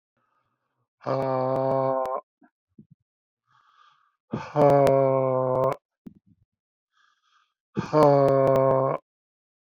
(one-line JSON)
{"exhalation_length": "9.7 s", "exhalation_amplitude": 15274, "exhalation_signal_mean_std_ratio": 0.45, "survey_phase": "beta (2021-08-13 to 2022-03-07)", "age": "45-64", "gender": "Male", "wearing_mask": "No", "symptom_cough_any": true, "symptom_shortness_of_breath": true, "symptom_fatigue": true, "symptom_change_to_sense_of_smell_or_taste": true, "smoker_status": "Never smoked", "respiratory_condition_asthma": false, "respiratory_condition_other": false, "recruitment_source": "Test and Trace", "submission_delay": "2 days", "covid_test_result": "Positive", "covid_test_method": "RT-qPCR", "covid_ct_value": 20.4, "covid_ct_gene": "ORF1ab gene"}